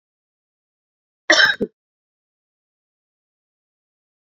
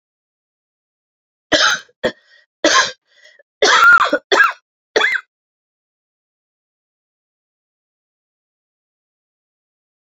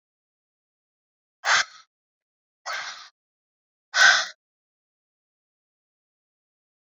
{
  "cough_length": "4.3 s",
  "cough_amplitude": 28581,
  "cough_signal_mean_std_ratio": 0.2,
  "three_cough_length": "10.2 s",
  "three_cough_amplitude": 31216,
  "three_cough_signal_mean_std_ratio": 0.31,
  "exhalation_length": "7.0 s",
  "exhalation_amplitude": 21399,
  "exhalation_signal_mean_std_ratio": 0.22,
  "survey_phase": "beta (2021-08-13 to 2022-03-07)",
  "age": "45-64",
  "gender": "Female",
  "wearing_mask": "No",
  "symptom_cough_any": true,
  "symptom_runny_or_blocked_nose": true,
  "symptom_fatigue": true,
  "symptom_change_to_sense_of_smell_or_taste": true,
  "symptom_loss_of_taste": true,
  "symptom_other": true,
  "symptom_onset": "6 days",
  "smoker_status": "Never smoked",
  "respiratory_condition_asthma": false,
  "respiratory_condition_other": false,
  "recruitment_source": "Test and Trace",
  "submission_delay": "2 days",
  "covid_test_result": "Positive",
  "covid_test_method": "RT-qPCR"
}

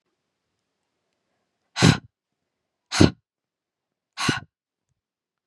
{
  "exhalation_length": "5.5 s",
  "exhalation_amplitude": 31733,
  "exhalation_signal_mean_std_ratio": 0.2,
  "survey_phase": "beta (2021-08-13 to 2022-03-07)",
  "age": "18-44",
  "gender": "Female",
  "wearing_mask": "No",
  "symptom_cough_any": true,
  "symptom_runny_or_blocked_nose": true,
  "symptom_sore_throat": true,
  "symptom_onset": "11 days",
  "smoker_status": "Never smoked",
  "respiratory_condition_asthma": false,
  "respiratory_condition_other": false,
  "recruitment_source": "REACT",
  "submission_delay": "4 days",
  "covid_test_result": "Negative",
  "covid_test_method": "RT-qPCR",
  "influenza_a_test_result": "Negative",
  "influenza_b_test_result": "Negative"
}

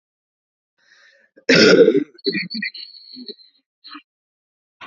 {
  "cough_length": "4.9 s",
  "cough_amplitude": 31803,
  "cough_signal_mean_std_ratio": 0.33,
  "survey_phase": "alpha (2021-03-01 to 2021-08-12)",
  "age": "45-64",
  "gender": "Female",
  "wearing_mask": "No",
  "symptom_cough_any": true,
  "symptom_shortness_of_breath": true,
  "symptom_fatigue": true,
  "symptom_headache": true,
  "smoker_status": "Ex-smoker",
  "respiratory_condition_asthma": true,
  "respiratory_condition_other": false,
  "recruitment_source": "Test and Trace",
  "submission_delay": "1 day",
  "covid_test_result": "Positive",
  "covid_test_method": "RT-qPCR",
  "covid_ct_value": 23.6,
  "covid_ct_gene": "ORF1ab gene",
  "covid_ct_mean": 26.2,
  "covid_viral_load": "2600 copies/ml",
  "covid_viral_load_category": "Minimal viral load (< 10K copies/ml)"
}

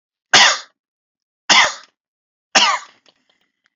{
  "three_cough_length": "3.8 s",
  "three_cough_amplitude": 32101,
  "three_cough_signal_mean_std_ratio": 0.34,
  "survey_phase": "beta (2021-08-13 to 2022-03-07)",
  "age": "45-64",
  "gender": "Male",
  "wearing_mask": "No",
  "symptom_none": true,
  "smoker_status": "Never smoked",
  "respiratory_condition_asthma": false,
  "respiratory_condition_other": false,
  "recruitment_source": "REACT",
  "submission_delay": "1 day",
  "covid_test_result": "Negative",
  "covid_test_method": "RT-qPCR",
  "influenza_a_test_result": "Negative",
  "influenza_b_test_result": "Negative"
}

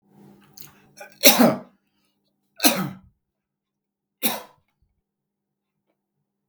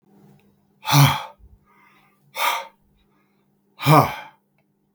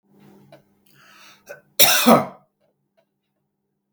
{
  "three_cough_length": "6.5 s",
  "three_cough_amplitude": 32768,
  "three_cough_signal_mean_std_ratio": 0.24,
  "exhalation_length": "4.9 s",
  "exhalation_amplitude": 32766,
  "exhalation_signal_mean_std_ratio": 0.32,
  "cough_length": "3.9 s",
  "cough_amplitude": 32768,
  "cough_signal_mean_std_ratio": 0.27,
  "survey_phase": "beta (2021-08-13 to 2022-03-07)",
  "age": "45-64",
  "gender": "Male",
  "wearing_mask": "No",
  "symptom_cough_any": true,
  "symptom_runny_or_blocked_nose": true,
  "symptom_onset": "8 days",
  "smoker_status": "Current smoker (1 to 10 cigarettes per day)",
  "respiratory_condition_asthma": false,
  "respiratory_condition_other": false,
  "recruitment_source": "REACT",
  "submission_delay": "1 day",
  "covid_test_result": "Negative",
  "covid_test_method": "RT-qPCR"
}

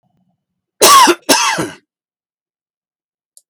{
  "cough_length": "3.5 s",
  "cough_amplitude": 32768,
  "cough_signal_mean_std_ratio": 0.37,
  "survey_phase": "beta (2021-08-13 to 2022-03-07)",
  "age": "65+",
  "gender": "Male",
  "wearing_mask": "No",
  "symptom_fatigue": true,
  "symptom_headache": true,
  "smoker_status": "Never smoked",
  "respiratory_condition_asthma": false,
  "respiratory_condition_other": false,
  "recruitment_source": "REACT",
  "submission_delay": "1 day",
  "covid_test_result": "Negative",
  "covid_test_method": "RT-qPCR"
}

